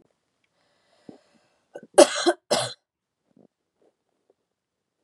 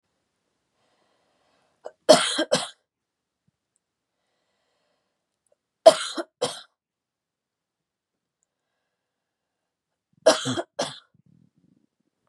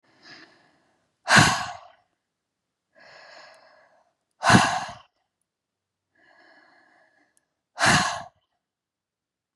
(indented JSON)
{
  "cough_length": "5.0 s",
  "cough_amplitude": 32015,
  "cough_signal_mean_std_ratio": 0.19,
  "three_cough_length": "12.3 s",
  "three_cough_amplitude": 32691,
  "three_cough_signal_mean_std_ratio": 0.18,
  "exhalation_length": "9.6 s",
  "exhalation_amplitude": 29042,
  "exhalation_signal_mean_std_ratio": 0.27,
  "survey_phase": "beta (2021-08-13 to 2022-03-07)",
  "age": "18-44",
  "gender": "Female",
  "wearing_mask": "No",
  "symptom_none": true,
  "symptom_onset": "5 days",
  "smoker_status": "Never smoked",
  "respiratory_condition_asthma": false,
  "respiratory_condition_other": false,
  "recruitment_source": "REACT",
  "submission_delay": "1 day",
  "covid_test_result": "Negative",
  "covid_test_method": "RT-qPCR",
  "influenza_a_test_result": "Negative",
  "influenza_b_test_result": "Negative"
}